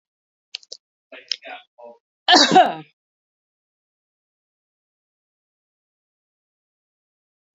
cough_length: 7.6 s
cough_amplitude: 32768
cough_signal_mean_std_ratio: 0.19
survey_phase: beta (2021-08-13 to 2022-03-07)
age: 45-64
gender: Female
wearing_mask: 'No'
symptom_fatigue: true
symptom_onset: 12 days
smoker_status: Ex-smoker
respiratory_condition_asthma: false
respiratory_condition_other: false
recruitment_source: REACT
submission_delay: 1 day
covid_test_result: Negative
covid_test_method: RT-qPCR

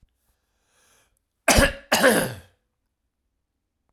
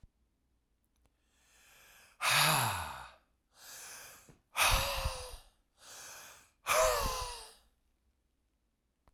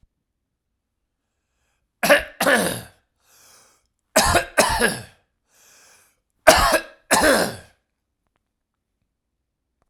cough_length: 3.9 s
cough_amplitude: 27991
cough_signal_mean_std_ratio: 0.31
exhalation_length: 9.1 s
exhalation_amplitude: 5958
exhalation_signal_mean_std_ratio: 0.41
three_cough_length: 9.9 s
three_cough_amplitude: 32768
three_cough_signal_mean_std_ratio: 0.34
survey_phase: alpha (2021-03-01 to 2021-08-12)
age: 45-64
gender: Male
wearing_mask: 'No'
symptom_fatigue: true
symptom_onset: 4 days
smoker_status: Never smoked
respiratory_condition_asthma: false
respiratory_condition_other: false
recruitment_source: Test and Trace
submission_delay: 2 days
covid_test_result: Positive
covid_test_method: RT-qPCR
covid_ct_value: 19.5
covid_ct_gene: ORF1ab gene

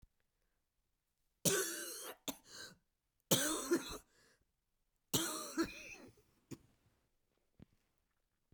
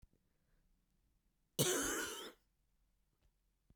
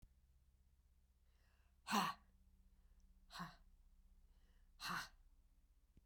three_cough_length: 8.5 s
three_cough_amplitude: 4693
three_cough_signal_mean_std_ratio: 0.35
cough_length: 3.8 s
cough_amplitude: 3252
cough_signal_mean_std_ratio: 0.33
exhalation_length: 6.1 s
exhalation_amplitude: 1700
exhalation_signal_mean_std_ratio: 0.33
survey_phase: beta (2021-08-13 to 2022-03-07)
age: 45-64
gender: Female
wearing_mask: 'No'
symptom_cough_any: true
symptom_runny_or_blocked_nose: true
symptom_sore_throat: true
symptom_fever_high_temperature: true
symptom_other: true
symptom_onset: 3 days
smoker_status: Never smoked
respiratory_condition_asthma: false
respiratory_condition_other: false
recruitment_source: Test and Trace
submission_delay: 1 day
covid_test_result: Positive
covid_test_method: RT-qPCR
covid_ct_value: 14.5
covid_ct_gene: ORF1ab gene
covid_ct_mean: 15.1
covid_viral_load: 11000000 copies/ml
covid_viral_load_category: High viral load (>1M copies/ml)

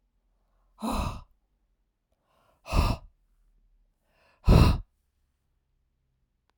exhalation_length: 6.6 s
exhalation_amplitude: 16695
exhalation_signal_mean_std_ratio: 0.26
survey_phase: alpha (2021-03-01 to 2021-08-12)
age: 45-64
gender: Female
wearing_mask: 'No'
symptom_none: true
smoker_status: Never smoked
respiratory_condition_asthma: false
respiratory_condition_other: false
recruitment_source: REACT
submission_delay: 1 day
covid_test_result: Negative
covid_test_method: RT-qPCR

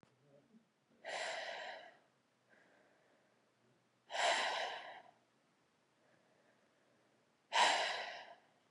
exhalation_length: 8.7 s
exhalation_amplitude: 3832
exhalation_signal_mean_std_ratio: 0.37
survey_phase: beta (2021-08-13 to 2022-03-07)
age: 18-44
gender: Female
wearing_mask: 'No'
symptom_cough_any: true
symptom_new_continuous_cough: true
symptom_runny_or_blocked_nose: true
symptom_shortness_of_breath: true
symptom_abdominal_pain: true
symptom_fatigue: true
symptom_headache: true
smoker_status: Never smoked
respiratory_condition_asthma: false
respiratory_condition_other: false
recruitment_source: Test and Trace
submission_delay: 1 day
covid_test_result: Positive
covid_test_method: RT-qPCR
covid_ct_value: 21.7
covid_ct_gene: ORF1ab gene
covid_ct_mean: 23.3
covid_viral_load: 24000 copies/ml
covid_viral_load_category: Low viral load (10K-1M copies/ml)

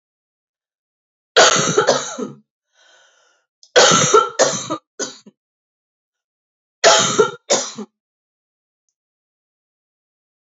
three_cough_length: 10.4 s
three_cough_amplitude: 32768
three_cough_signal_mean_std_ratio: 0.35
survey_phase: beta (2021-08-13 to 2022-03-07)
age: 45-64
gender: Female
wearing_mask: 'No'
symptom_runny_or_blocked_nose: true
symptom_onset: 12 days
smoker_status: Never smoked
respiratory_condition_asthma: false
respiratory_condition_other: false
recruitment_source: REACT
submission_delay: 3 days
covid_test_result: Negative
covid_test_method: RT-qPCR
influenza_a_test_result: Negative
influenza_b_test_result: Negative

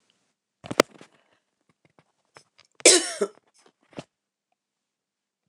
cough_length: 5.5 s
cough_amplitude: 29204
cough_signal_mean_std_ratio: 0.17
survey_phase: beta (2021-08-13 to 2022-03-07)
age: 65+
gender: Female
wearing_mask: 'No'
symptom_none: true
smoker_status: Never smoked
respiratory_condition_asthma: false
respiratory_condition_other: false
recruitment_source: REACT
submission_delay: 8 days
covid_test_result: Negative
covid_test_method: RT-qPCR
influenza_a_test_result: Negative
influenza_b_test_result: Negative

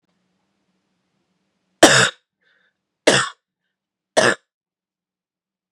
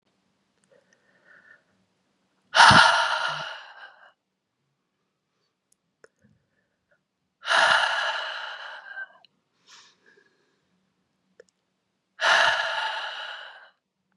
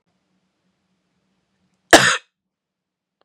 three_cough_length: 5.7 s
three_cough_amplitude: 32768
three_cough_signal_mean_std_ratio: 0.25
exhalation_length: 14.2 s
exhalation_amplitude: 29917
exhalation_signal_mean_std_ratio: 0.32
cough_length: 3.2 s
cough_amplitude: 32768
cough_signal_mean_std_ratio: 0.19
survey_phase: beta (2021-08-13 to 2022-03-07)
age: 18-44
gender: Male
wearing_mask: 'No'
symptom_other: true
symptom_onset: 4 days
smoker_status: Never smoked
respiratory_condition_asthma: false
respiratory_condition_other: false
recruitment_source: Test and Trace
submission_delay: 1 day
covid_test_result: Positive
covid_test_method: LAMP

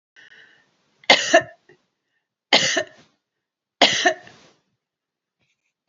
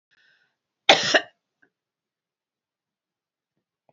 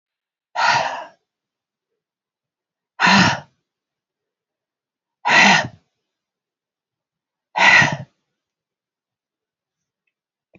three_cough_length: 5.9 s
three_cough_amplitude: 30737
three_cough_signal_mean_std_ratio: 0.28
cough_length: 3.9 s
cough_amplitude: 28392
cough_signal_mean_std_ratio: 0.18
exhalation_length: 10.6 s
exhalation_amplitude: 29657
exhalation_signal_mean_std_ratio: 0.3
survey_phase: beta (2021-08-13 to 2022-03-07)
age: 65+
gender: Female
wearing_mask: 'No'
symptom_diarrhoea: true
symptom_onset: 13 days
smoker_status: Never smoked
respiratory_condition_asthma: false
respiratory_condition_other: true
recruitment_source: REACT
submission_delay: 1 day
covid_test_result: Negative
covid_test_method: RT-qPCR
influenza_a_test_result: Negative
influenza_b_test_result: Negative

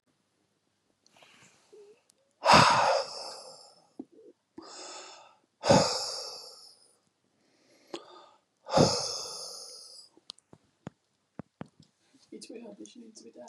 exhalation_length: 13.5 s
exhalation_amplitude: 18650
exhalation_signal_mean_std_ratio: 0.3
survey_phase: beta (2021-08-13 to 2022-03-07)
age: 65+
gender: Male
wearing_mask: 'No'
symptom_none: true
smoker_status: Never smoked
respiratory_condition_asthma: false
respiratory_condition_other: false
recruitment_source: REACT
submission_delay: 2 days
covid_test_result: Negative
covid_test_method: RT-qPCR
influenza_a_test_result: Negative
influenza_b_test_result: Negative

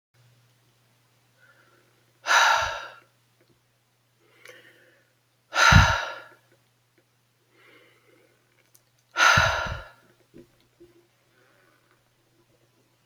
exhalation_length: 13.1 s
exhalation_amplitude: 25873
exhalation_signal_mean_std_ratio: 0.27
survey_phase: beta (2021-08-13 to 2022-03-07)
age: 65+
gender: Male
wearing_mask: 'No'
symptom_cough_any: true
symptom_fatigue: true
symptom_onset: 7 days
smoker_status: Never smoked
respiratory_condition_asthma: false
respiratory_condition_other: false
recruitment_source: Test and Trace
submission_delay: 2 days
covid_test_result: Positive
covid_test_method: RT-qPCR
covid_ct_value: 15.7
covid_ct_gene: ORF1ab gene
covid_ct_mean: 16.3
covid_viral_load: 4600000 copies/ml
covid_viral_load_category: High viral load (>1M copies/ml)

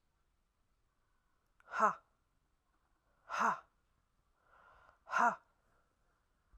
exhalation_length: 6.6 s
exhalation_amplitude: 4469
exhalation_signal_mean_std_ratio: 0.25
survey_phase: alpha (2021-03-01 to 2021-08-12)
age: 45-64
gender: Female
wearing_mask: 'No'
symptom_none: true
smoker_status: Never smoked
respiratory_condition_asthma: false
respiratory_condition_other: false
recruitment_source: REACT
submission_delay: 1 day
covid_test_result: Negative
covid_test_method: RT-qPCR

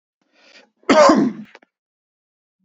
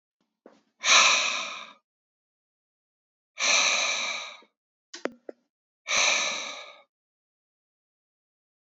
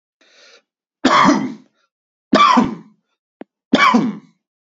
cough_length: 2.6 s
cough_amplitude: 29628
cough_signal_mean_std_ratio: 0.34
exhalation_length: 8.7 s
exhalation_amplitude: 18957
exhalation_signal_mean_std_ratio: 0.38
three_cough_length: 4.8 s
three_cough_amplitude: 32768
three_cough_signal_mean_std_ratio: 0.43
survey_phase: beta (2021-08-13 to 2022-03-07)
age: 45-64
gender: Male
wearing_mask: 'No'
symptom_none: true
smoker_status: Never smoked
respiratory_condition_asthma: false
respiratory_condition_other: false
recruitment_source: REACT
submission_delay: 1 day
covid_test_result: Negative
covid_test_method: RT-qPCR
influenza_a_test_result: Negative
influenza_b_test_result: Negative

